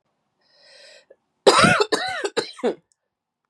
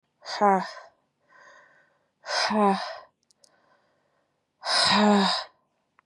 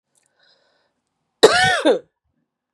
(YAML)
three_cough_length: 3.5 s
three_cough_amplitude: 32287
three_cough_signal_mean_std_ratio: 0.37
exhalation_length: 6.1 s
exhalation_amplitude: 15415
exhalation_signal_mean_std_ratio: 0.42
cough_length: 2.7 s
cough_amplitude: 32768
cough_signal_mean_std_ratio: 0.32
survey_phase: beta (2021-08-13 to 2022-03-07)
age: 18-44
gender: Female
wearing_mask: 'No'
symptom_cough_any: true
symptom_new_continuous_cough: true
symptom_runny_or_blocked_nose: true
symptom_shortness_of_breath: true
symptom_sore_throat: true
symptom_diarrhoea: true
symptom_fatigue: true
smoker_status: Current smoker (e-cigarettes or vapes only)
respiratory_condition_asthma: false
respiratory_condition_other: false
recruitment_source: Test and Trace
submission_delay: 2 days
covid_test_result: Positive
covid_test_method: LFT